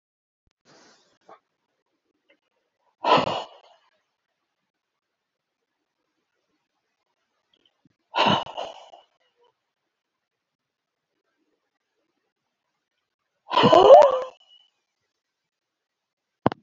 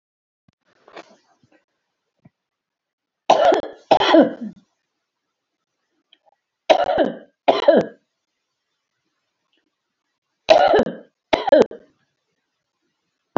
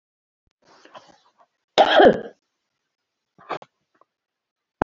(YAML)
exhalation_length: 16.6 s
exhalation_amplitude: 29113
exhalation_signal_mean_std_ratio: 0.2
three_cough_length: 13.4 s
three_cough_amplitude: 30572
three_cough_signal_mean_std_ratio: 0.3
cough_length: 4.8 s
cough_amplitude: 28035
cough_signal_mean_std_ratio: 0.23
survey_phase: alpha (2021-03-01 to 2021-08-12)
age: 65+
gender: Female
wearing_mask: 'No'
symptom_none: true
smoker_status: Ex-smoker
respiratory_condition_asthma: false
respiratory_condition_other: true
recruitment_source: REACT
submission_delay: 2 days
covid_test_result: Negative
covid_test_method: RT-qPCR